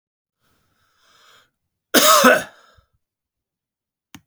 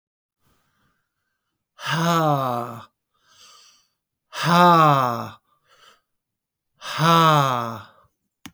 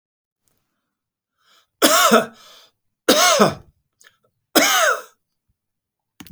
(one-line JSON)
{"cough_length": "4.3 s", "cough_amplitude": 32768, "cough_signal_mean_std_ratio": 0.27, "exhalation_length": "8.5 s", "exhalation_amplitude": 25193, "exhalation_signal_mean_std_ratio": 0.42, "three_cough_length": "6.3 s", "three_cough_amplitude": 32768, "three_cough_signal_mean_std_ratio": 0.37, "survey_phase": "beta (2021-08-13 to 2022-03-07)", "age": "45-64", "gender": "Male", "wearing_mask": "No", "symptom_none": true, "smoker_status": "Never smoked", "respiratory_condition_asthma": false, "respiratory_condition_other": false, "recruitment_source": "REACT", "submission_delay": "2 days", "covid_test_result": "Negative", "covid_test_method": "RT-qPCR"}